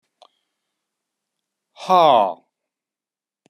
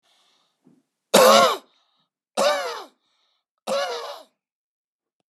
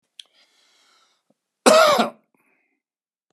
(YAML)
exhalation_length: 3.5 s
exhalation_amplitude: 27859
exhalation_signal_mean_std_ratio: 0.26
three_cough_length: 5.3 s
three_cough_amplitude: 32034
three_cough_signal_mean_std_ratio: 0.34
cough_length: 3.3 s
cough_amplitude: 30800
cough_signal_mean_std_ratio: 0.29
survey_phase: beta (2021-08-13 to 2022-03-07)
age: 65+
gender: Male
wearing_mask: 'No'
symptom_none: true
smoker_status: Never smoked
respiratory_condition_asthma: false
respiratory_condition_other: false
recruitment_source: REACT
submission_delay: 1 day
covid_test_result: Negative
covid_test_method: RT-qPCR